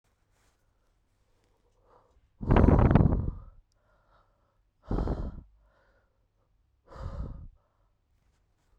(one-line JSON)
{"exhalation_length": "8.8 s", "exhalation_amplitude": 16682, "exhalation_signal_mean_std_ratio": 0.29, "survey_phase": "beta (2021-08-13 to 2022-03-07)", "age": "18-44", "gender": "Female", "wearing_mask": "No", "symptom_cough_any": true, "symptom_new_continuous_cough": true, "symptom_runny_or_blocked_nose": true, "symptom_sore_throat": true, "symptom_headache": true, "smoker_status": "Ex-smoker", "respiratory_condition_asthma": false, "respiratory_condition_other": false, "recruitment_source": "Test and Trace", "submission_delay": "1 day", "covid_test_result": "Positive", "covid_test_method": "LFT"}